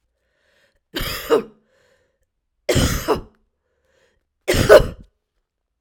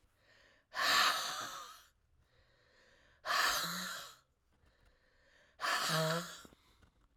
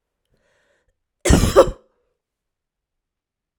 {"three_cough_length": "5.8 s", "three_cough_amplitude": 32768, "three_cough_signal_mean_std_ratio": 0.31, "exhalation_length": "7.2 s", "exhalation_amplitude": 4166, "exhalation_signal_mean_std_ratio": 0.47, "cough_length": "3.6 s", "cough_amplitude": 32768, "cough_signal_mean_std_ratio": 0.25, "survey_phase": "alpha (2021-03-01 to 2021-08-12)", "age": "45-64", "gender": "Female", "wearing_mask": "No", "symptom_cough_any": true, "symptom_fatigue": true, "symptom_headache": true, "smoker_status": "Never smoked", "respiratory_condition_asthma": false, "respiratory_condition_other": false, "recruitment_source": "Test and Trace", "submission_delay": "2 days", "covid_test_result": "Positive", "covid_test_method": "RT-qPCR", "covid_ct_value": 22.3, "covid_ct_gene": "ORF1ab gene", "covid_ct_mean": 22.7, "covid_viral_load": "35000 copies/ml", "covid_viral_load_category": "Low viral load (10K-1M copies/ml)"}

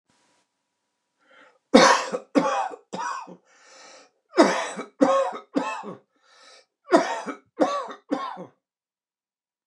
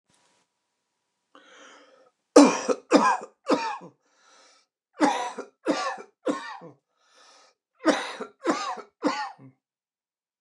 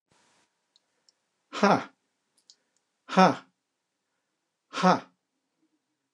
{"three_cough_length": "9.7 s", "three_cough_amplitude": 29204, "three_cough_signal_mean_std_ratio": 0.37, "cough_length": "10.4 s", "cough_amplitude": 29203, "cough_signal_mean_std_ratio": 0.33, "exhalation_length": "6.1 s", "exhalation_amplitude": 22632, "exhalation_signal_mean_std_ratio": 0.23, "survey_phase": "alpha (2021-03-01 to 2021-08-12)", "age": "65+", "gender": "Male", "wearing_mask": "No", "symptom_none": true, "smoker_status": "Never smoked", "respiratory_condition_asthma": false, "respiratory_condition_other": false, "recruitment_source": "REACT", "submission_delay": "2 days", "covid_test_result": "Negative", "covid_test_method": "RT-qPCR", "covid_ct_value": 46.0, "covid_ct_gene": "N gene"}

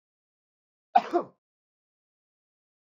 {"cough_length": "2.9 s", "cough_amplitude": 15183, "cough_signal_mean_std_ratio": 0.17, "survey_phase": "beta (2021-08-13 to 2022-03-07)", "age": "45-64", "gender": "Male", "wearing_mask": "No", "symptom_cough_any": true, "symptom_runny_or_blocked_nose": true, "symptom_onset": "3 days", "smoker_status": "Never smoked", "respiratory_condition_asthma": false, "respiratory_condition_other": false, "recruitment_source": "Test and Trace", "submission_delay": "1 day", "covid_test_result": "Positive", "covid_test_method": "RT-qPCR", "covid_ct_value": 22.2, "covid_ct_gene": "ORF1ab gene", "covid_ct_mean": 23.0, "covid_viral_load": "29000 copies/ml", "covid_viral_load_category": "Low viral load (10K-1M copies/ml)"}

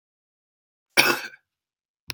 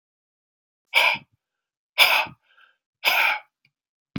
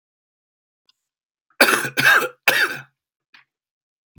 {"cough_length": "2.1 s", "cough_amplitude": 28730, "cough_signal_mean_std_ratio": 0.24, "exhalation_length": "4.2 s", "exhalation_amplitude": 31928, "exhalation_signal_mean_std_ratio": 0.36, "three_cough_length": "4.2 s", "three_cough_amplitude": 32767, "three_cough_signal_mean_std_ratio": 0.34, "survey_phase": "beta (2021-08-13 to 2022-03-07)", "age": "45-64", "gender": "Male", "wearing_mask": "No", "symptom_cough_any": true, "symptom_runny_or_blocked_nose": true, "symptom_diarrhoea": true, "symptom_onset": "2 days", "smoker_status": "Never smoked", "respiratory_condition_asthma": false, "respiratory_condition_other": false, "recruitment_source": "Test and Trace", "submission_delay": "1 day", "covid_test_result": "Negative", "covid_test_method": "RT-qPCR"}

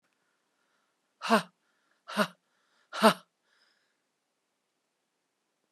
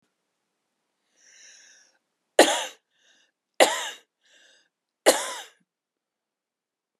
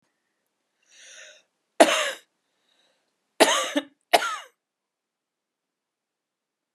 {"exhalation_length": "5.7 s", "exhalation_amplitude": 15894, "exhalation_signal_mean_std_ratio": 0.2, "three_cough_length": "7.0 s", "three_cough_amplitude": 27603, "three_cough_signal_mean_std_ratio": 0.21, "cough_length": "6.7 s", "cough_amplitude": 29837, "cough_signal_mean_std_ratio": 0.24, "survey_phase": "beta (2021-08-13 to 2022-03-07)", "age": "45-64", "gender": "Female", "wearing_mask": "No", "symptom_runny_or_blocked_nose": true, "symptom_abdominal_pain": true, "symptom_diarrhoea": true, "symptom_fatigue": true, "symptom_headache": true, "symptom_change_to_sense_of_smell_or_taste": true, "symptom_loss_of_taste": true, "symptom_other": true, "symptom_onset": "6 days", "smoker_status": "Current smoker (1 to 10 cigarettes per day)", "respiratory_condition_asthma": false, "respiratory_condition_other": false, "recruitment_source": "Test and Trace", "submission_delay": "3 days", "covid_test_result": "Positive", "covid_test_method": "RT-qPCR", "covid_ct_value": 18.6, "covid_ct_gene": "ORF1ab gene", "covid_ct_mean": 19.7, "covid_viral_load": "350000 copies/ml", "covid_viral_load_category": "Low viral load (10K-1M copies/ml)"}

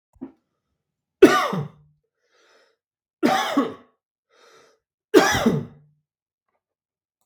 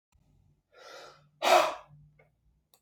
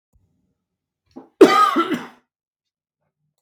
{"three_cough_length": "7.3 s", "three_cough_amplitude": 32768, "three_cough_signal_mean_std_ratio": 0.3, "exhalation_length": "2.8 s", "exhalation_amplitude": 11193, "exhalation_signal_mean_std_ratio": 0.28, "cough_length": "3.4 s", "cough_amplitude": 32768, "cough_signal_mean_std_ratio": 0.28, "survey_phase": "beta (2021-08-13 to 2022-03-07)", "age": "45-64", "gender": "Male", "wearing_mask": "No", "symptom_none": true, "smoker_status": "Never smoked", "respiratory_condition_asthma": false, "respiratory_condition_other": false, "recruitment_source": "REACT", "submission_delay": "1 day", "covid_test_result": "Negative", "covid_test_method": "RT-qPCR", "influenza_a_test_result": "Unknown/Void", "influenza_b_test_result": "Unknown/Void"}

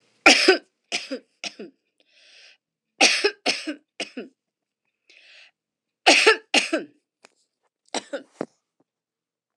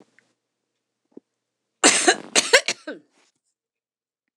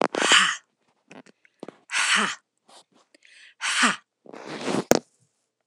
{"three_cough_length": "9.6 s", "three_cough_amplitude": 26028, "three_cough_signal_mean_std_ratio": 0.29, "cough_length": "4.4 s", "cough_amplitude": 26028, "cough_signal_mean_std_ratio": 0.26, "exhalation_length": "5.7 s", "exhalation_amplitude": 26028, "exhalation_signal_mean_std_ratio": 0.39, "survey_phase": "alpha (2021-03-01 to 2021-08-12)", "age": "65+", "gender": "Female", "wearing_mask": "No", "symptom_none": true, "smoker_status": "Ex-smoker", "respiratory_condition_asthma": false, "respiratory_condition_other": false, "recruitment_source": "REACT", "submission_delay": "1 day", "covid_test_result": "Negative", "covid_test_method": "RT-qPCR"}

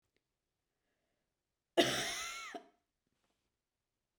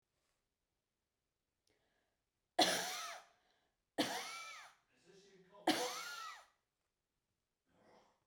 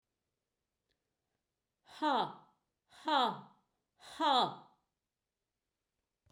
{"cough_length": "4.2 s", "cough_amplitude": 7574, "cough_signal_mean_std_ratio": 0.26, "three_cough_length": "8.3 s", "three_cough_amplitude": 3918, "three_cough_signal_mean_std_ratio": 0.31, "exhalation_length": "6.3 s", "exhalation_amplitude": 4552, "exhalation_signal_mean_std_ratio": 0.31, "survey_phase": "beta (2021-08-13 to 2022-03-07)", "age": "45-64", "gender": "Female", "wearing_mask": "No", "symptom_none": true, "smoker_status": "Never smoked", "respiratory_condition_asthma": false, "respiratory_condition_other": false, "recruitment_source": "REACT", "submission_delay": "1 day", "covid_test_result": "Negative", "covid_test_method": "RT-qPCR", "influenza_a_test_result": "Negative", "influenza_b_test_result": "Negative"}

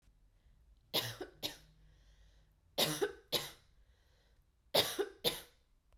{"three_cough_length": "6.0 s", "three_cough_amplitude": 7156, "three_cough_signal_mean_std_ratio": 0.36, "survey_phase": "beta (2021-08-13 to 2022-03-07)", "age": "18-44", "gender": "Female", "wearing_mask": "No", "symptom_runny_or_blocked_nose": true, "symptom_sore_throat": true, "smoker_status": "Never smoked", "respiratory_condition_asthma": false, "respiratory_condition_other": false, "recruitment_source": "Test and Trace", "submission_delay": "2 days", "covid_test_result": "Positive", "covid_test_method": "RT-qPCR", "covid_ct_value": 20.3, "covid_ct_gene": "ORF1ab gene"}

